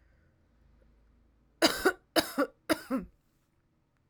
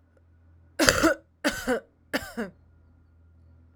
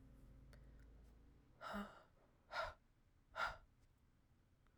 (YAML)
cough_length: 4.1 s
cough_amplitude: 11500
cough_signal_mean_std_ratio: 0.3
three_cough_length: 3.8 s
three_cough_amplitude: 32768
three_cough_signal_mean_std_ratio: 0.36
exhalation_length: 4.8 s
exhalation_amplitude: 884
exhalation_signal_mean_std_ratio: 0.45
survey_phase: alpha (2021-03-01 to 2021-08-12)
age: 18-44
gender: Female
wearing_mask: 'No'
symptom_cough_any: true
symptom_fatigue: true
symptom_headache: true
symptom_change_to_sense_of_smell_or_taste: true
symptom_onset: 6 days
smoker_status: Current smoker (1 to 10 cigarettes per day)
respiratory_condition_asthma: false
respiratory_condition_other: false
recruitment_source: Test and Trace
submission_delay: 2 days
covid_test_result: Positive
covid_test_method: RT-qPCR
covid_ct_value: 20.3
covid_ct_gene: ORF1ab gene
covid_ct_mean: 21.1
covid_viral_load: 120000 copies/ml
covid_viral_load_category: Low viral load (10K-1M copies/ml)